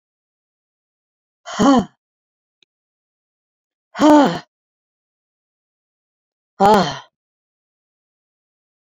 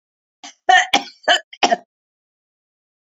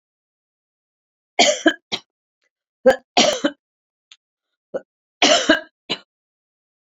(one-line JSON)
{"exhalation_length": "8.9 s", "exhalation_amplitude": 28609, "exhalation_signal_mean_std_ratio": 0.26, "cough_length": "3.1 s", "cough_amplitude": 29343, "cough_signal_mean_std_ratio": 0.31, "three_cough_length": "6.8 s", "three_cough_amplitude": 29528, "three_cough_signal_mean_std_ratio": 0.3, "survey_phase": "beta (2021-08-13 to 2022-03-07)", "age": "65+", "gender": "Female", "wearing_mask": "No", "symptom_none": true, "smoker_status": "Never smoked", "respiratory_condition_asthma": false, "respiratory_condition_other": false, "recruitment_source": "Test and Trace", "submission_delay": "1 day", "covid_test_result": "Positive", "covid_test_method": "RT-qPCR", "covid_ct_value": 22.1, "covid_ct_gene": "ORF1ab gene", "covid_ct_mean": 22.7, "covid_viral_load": "36000 copies/ml", "covid_viral_load_category": "Low viral load (10K-1M copies/ml)"}